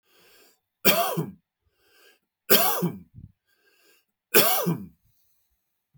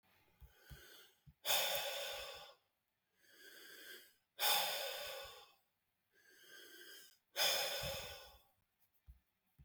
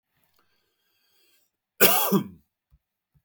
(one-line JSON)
{"three_cough_length": "6.0 s", "three_cough_amplitude": 21739, "three_cough_signal_mean_std_ratio": 0.35, "exhalation_length": "9.6 s", "exhalation_amplitude": 2634, "exhalation_signal_mean_std_ratio": 0.44, "cough_length": "3.2 s", "cough_amplitude": 20214, "cough_signal_mean_std_ratio": 0.27, "survey_phase": "beta (2021-08-13 to 2022-03-07)", "age": "45-64", "gender": "Male", "wearing_mask": "No", "symptom_none": true, "smoker_status": "Ex-smoker", "respiratory_condition_asthma": false, "respiratory_condition_other": false, "recruitment_source": "Test and Trace", "submission_delay": "3 days", "covid_test_result": "Negative", "covid_test_method": "ePCR"}